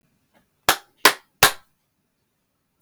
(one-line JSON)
{"three_cough_length": "2.8 s", "three_cough_amplitude": 32768, "three_cough_signal_mean_std_ratio": 0.2, "survey_phase": "beta (2021-08-13 to 2022-03-07)", "age": "18-44", "gender": "Male", "wearing_mask": "Prefer not to say", "symptom_none": true, "smoker_status": "Never smoked", "respiratory_condition_asthma": false, "respiratory_condition_other": false, "recruitment_source": "REACT", "submission_delay": "5 days", "covid_test_result": "Negative", "covid_test_method": "RT-qPCR", "influenza_a_test_result": "Negative", "influenza_b_test_result": "Negative"}